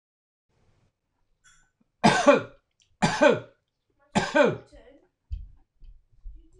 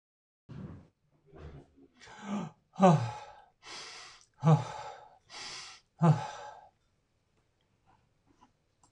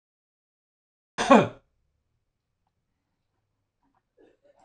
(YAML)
three_cough_length: 6.6 s
three_cough_amplitude: 21828
three_cough_signal_mean_std_ratio: 0.31
exhalation_length: 8.9 s
exhalation_amplitude: 9308
exhalation_signal_mean_std_ratio: 0.3
cough_length: 4.6 s
cough_amplitude: 22302
cough_signal_mean_std_ratio: 0.17
survey_phase: beta (2021-08-13 to 2022-03-07)
age: 65+
gender: Male
wearing_mask: 'No'
symptom_none: true
smoker_status: Ex-smoker
respiratory_condition_asthma: false
respiratory_condition_other: false
recruitment_source: REACT
submission_delay: 1 day
covid_test_result: Negative
covid_test_method: RT-qPCR